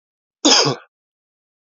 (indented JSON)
{
  "cough_length": "1.6 s",
  "cough_amplitude": 28914,
  "cough_signal_mean_std_ratio": 0.34,
  "survey_phase": "beta (2021-08-13 to 2022-03-07)",
  "age": "45-64",
  "gender": "Male",
  "wearing_mask": "No",
  "symptom_cough_any": true,
  "symptom_runny_or_blocked_nose": true,
  "symptom_sore_throat": true,
  "symptom_change_to_sense_of_smell_or_taste": true,
  "symptom_onset": "6 days",
  "smoker_status": "Ex-smoker",
  "respiratory_condition_asthma": false,
  "respiratory_condition_other": false,
  "recruitment_source": "Test and Trace",
  "submission_delay": "1 day",
  "covid_test_result": "Positive",
  "covid_test_method": "ePCR"
}